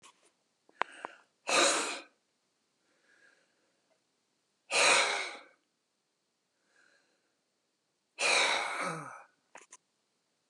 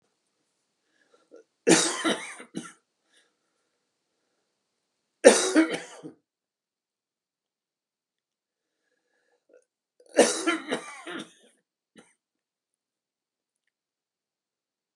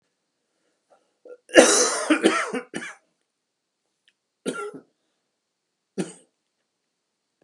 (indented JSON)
{
  "exhalation_length": "10.5 s",
  "exhalation_amplitude": 11955,
  "exhalation_signal_mean_std_ratio": 0.34,
  "three_cough_length": "15.0 s",
  "three_cough_amplitude": 32439,
  "three_cough_signal_mean_std_ratio": 0.22,
  "cough_length": "7.4 s",
  "cough_amplitude": 32768,
  "cough_signal_mean_std_ratio": 0.28,
  "survey_phase": "beta (2021-08-13 to 2022-03-07)",
  "age": "65+",
  "gender": "Male",
  "wearing_mask": "No",
  "symptom_cough_any": true,
  "symptom_onset": "12 days",
  "smoker_status": "Ex-smoker",
  "respiratory_condition_asthma": false,
  "respiratory_condition_other": false,
  "recruitment_source": "REACT",
  "submission_delay": "3 days",
  "covid_test_result": "Negative",
  "covid_test_method": "RT-qPCR",
  "influenza_a_test_result": "Negative",
  "influenza_b_test_result": "Negative"
}